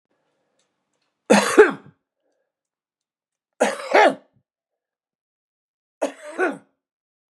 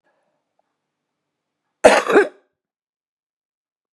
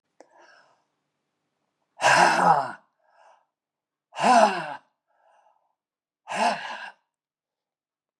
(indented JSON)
{
  "three_cough_length": "7.3 s",
  "three_cough_amplitude": 32724,
  "three_cough_signal_mean_std_ratio": 0.26,
  "cough_length": "3.9 s",
  "cough_amplitude": 32768,
  "cough_signal_mean_std_ratio": 0.23,
  "exhalation_length": "8.2 s",
  "exhalation_amplitude": 22248,
  "exhalation_signal_mean_std_ratio": 0.33,
  "survey_phase": "beta (2021-08-13 to 2022-03-07)",
  "age": "65+",
  "gender": "Male",
  "wearing_mask": "No",
  "symptom_none": true,
  "smoker_status": "Current smoker (11 or more cigarettes per day)",
  "respiratory_condition_asthma": false,
  "respiratory_condition_other": false,
  "recruitment_source": "REACT",
  "submission_delay": "1 day",
  "covid_test_result": "Negative",
  "covid_test_method": "RT-qPCR",
  "influenza_a_test_result": "Negative",
  "influenza_b_test_result": "Negative"
}